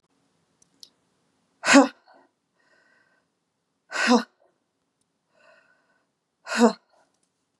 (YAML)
exhalation_length: 7.6 s
exhalation_amplitude: 28913
exhalation_signal_mean_std_ratio: 0.21
survey_phase: beta (2021-08-13 to 2022-03-07)
age: 45-64
gender: Female
wearing_mask: 'No'
symptom_none: true
smoker_status: Ex-smoker
respiratory_condition_asthma: false
respiratory_condition_other: false
recruitment_source: REACT
submission_delay: 1 day
covid_test_result: Negative
covid_test_method: RT-qPCR
influenza_a_test_result: Negative
influenza_b_test_result: Negative